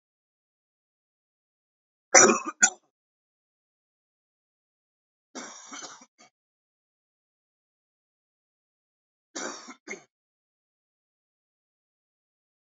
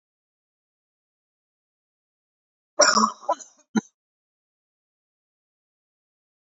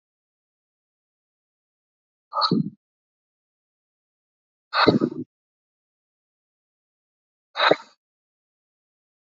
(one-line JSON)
{"three_cough_length": "12.7 s", "three_cough_amplitude": 25310, "three_cough_signal_mean_std_ratio": 0.14, "cough_length": "6.5 s", "cough_amplitude": 23719, "cough_signal_mean_std_ratio": 0.19, "exhalation_length": "9.2 s", "exhalation_amplitude": 26149, "exhalation_signal_mean_std_ratio": 0.22, "survey_phase": "alpha (2021-03-01 to 2021-08-12)", "age": "18-44", "gender": "Male", "wearing_mask": "No", "symptom_cough_any": true, "symptom_fatigue": true, "symptom_headache": true, "symptom_change_to_sense_of_smell_or_taste": true, "symptom_onset": "3 days", "smoker_status": "Never smoked", "respiratory_condition_asthma": false, "respiratory_condition_other": false, "recruitment_source": "Test and Trace", "submission_delay": "2 days", "covid_test_result": "Positive", "covid_test_method": "RT-qPCR"}